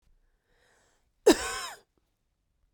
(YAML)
cough_length: 2.7 s
cough_amplitude: 15022
cough_signal_mean_std_ratio: 0.21
survey_phase: beta (2021-08-13 to 2022-03-07)
age: 18-44
gender: Female
wearing_mask: 'No'
symptom_runny_or_blocked_nose: true
symptom_fatigue: true
symptom_fever_high_temperature: true
symptom_headache: true
symptom_other: true
symptom_onset: 5 days
smoker_status: Ex-smoker
respiratory_condition_asthma: false
respiratory_condition_other: false
recruitment_source: Test and Trace
submission_delay: 2 days
covid_test_result: Positive
covid_test_method: RT-qPCR
covid_ct_value: 26.7
covid_ct_gene: N gene